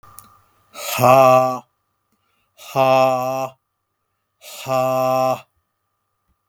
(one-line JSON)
{"exhalation_length": "6.5 s", "exhalation_amplitude": 32766, "exhalation_signal_mean_std_ratio": 0.45, "survey_phase": "beta (2021-08-13 to 2022-03-07)", "age": "45-64", "gender": "Male", "wearing_mask": "No", "symptom_none": true, "smoker_status": "Never smoked", "respiratory_condition_asthma": false, "respiratory_condition_other": false, "recruitment_source": "REACT", "submission_delay": "1 day", "covid_test_result": "Negative", "covid_test_method": "RT-qPCR", "influenza_a_test_result": "Negative", "influenza_b_test_result": "Negative"}